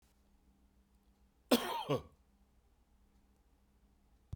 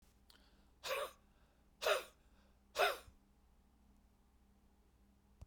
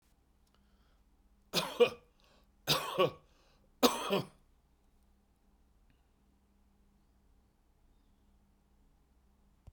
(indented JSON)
{
  "cough_length": "4.4 s",
  "cough_amplitude": 5986,
  "cough_signal_mean_std_ratio": 0.25,
  "exhalation_length": "5.5 s",
  "exhalation_amplitude": 2737,
  "exhalation_signal_mean_std_ratio": 0.3,
  "three_cough_length": "9.7 s",
  "three_cough_amplitude": 10212,
  "three_cough_signal_mean_std_ratio": 0.25,
  "survey_phase": "beta (2021-08-13 to 2022-03-07)",
  "age": "65+",
  "gender": "Male",
  "wearing_mask": "No",
  "symptom_none": true,
  "smoker_status": "Never smoked",
  "respiratory_condition_asthma": false,
  "respiratory_condition_other": false,
  "recruitment_source": "REACT",
  "submission_delay": "7 days",
  "covid_test_result": "Negative",
  "covid_test_method": "RT-qPCR"
}